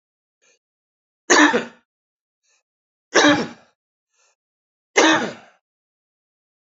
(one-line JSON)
{"three_cough_length": "6.7 s", "three_cough_amplitude": 28277, "three_cough_signal_mean_std_ratio": 0.29, "survey_phase": "beta (2021-08-13 to 2022-03-07)", "age": "45-64", "gender": "Male", "wearing_mask": "No", "symptom_cough_any": true, "symptom_runny_or_blocked_nose": true, "symptom_fatigue": true, "symptom_fever_high_temperature": true, "symptom_headache": true, "symptom_change_to_sense_of_smell_or_taste": true, "symptom_loss_of_taste": true, "symptom_onset": "2 days", "smoker_status": "Never smoked", "respiratory_condition_asthma": false, "respiratory_condition_other": false, "recruitment_source": "Test and Trace", "submission_delay": "1 day", "covid_test_result": "Positive", "covid_test_method": "RT-qPCR"}